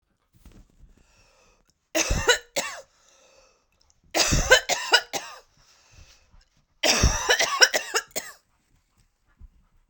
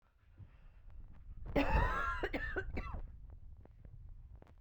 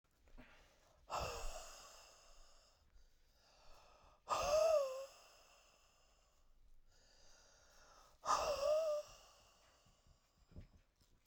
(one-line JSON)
{"three_cough_length": "9.9 s", "three_cough_amplitude": 32767, "three_cough_signal_mean_std_ratio": 0.36, "cough_length": "4.6 s", "cough_amplitude": 3449, "cough_signal_mean_std_ratio": 0.59, "exhalation_length": "11.3 s", "exhalation_amplitude": 1947, "exhalation_signal_mean_std_ratio": 0.4, "survey_phase": "beta (2021-08-13 to 2022-03-07)", "age": "18-44", "gender": "Female", "wearing_mask": "No", "symptom_cough_any": true, "symptom_runny_or_blocked_nose": true, "symptom_abdominal_pain": true, "symptom_fatigue": true, "symptom_loss_of_taste": true, "symptom_onset": "2 days", "smoker_status": "Never smoked", "respiratory_condition_asthma": false, "respiratory_condition_other": false, "recruitment_source": "Test and Trace", "submission_delay": "2 days", "covid_test_result": "Positive", "covid_test_method": "RT-qPCR", "covid_ct_value": 15.5, "covid_ct_gene": "N gene", "covid_ct_mean": 16.7, "covid_viral_load": "3400000 copies/ml", "covid_viral_load_category": "High viral load (>1M copies/ml)"}